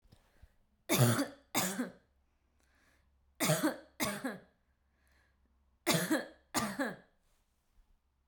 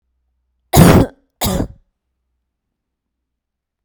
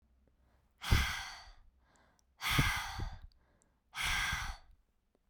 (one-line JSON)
{"three_cough_length": "8.3 s", "three_cough_amplitude": 6376, "three_cough_signal_mean_std_ratio": 0.39, "cough_length": "3.8 s", "cough_amplitude": 32768, "cough_signal_mean_std_ratio": 0.29, "exhalation_length": "5.3 s", "exhalation_amplitude": 6791, "exhalation_signal_mean_std_ratio": 0.45, "survey_phase": "beta (2021-08-13 to 2022-03-07)", "age": "18-44", "gender": "Female", "wearing_mask": "No", "symptom_none": true, "smoker_status": "Ex-smoker", "respiratory_condition_asthma": false, "respiratory_condition_other": false, "recruitment_source": "REACT", "submission_delay": "1 day", "covid_test_result": "Negative", "covid_test_method": "RT-qPCR"}